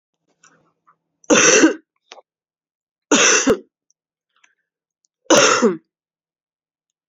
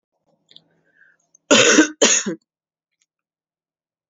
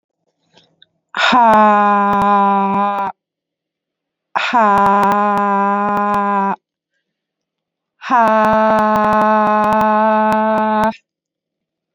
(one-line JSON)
{"three_cough_length": "7.1 s", "three_cough_amplitude": 31523, "three_cough_signal_mean_std_ratio": 0.35, "cough_length": "4.1 s", "cough_amplitude": 31868, "cough_signal_mean_std_ratio": 0.31, "exhalation_length": "11.9 s", "exhalation_amplitude": 31619, "exhalation_signal_mean_std_ratio": 0.71, "survey_phase": "beta (2021-08-13 to 2022-03-07)", "age": "18-44", "gender": "Female", "wearing_mask": "No", "symptom_cough_any": true, "symptom_runny_or_blocked_nose": true, "symptom_sore_throat": true, "symptom_fatigue": true, "symptom_change_to_sense_of_smell_or_taste": true, "smoker_status": "Never smoked", "respiratory_condition_asthma": false, "respiratory_condition_other": false, "recruitment_source": "Test and Trace", "submission_delay": "1 day", "covid_test_result": "Positive", "covid_test_method": "LFT"}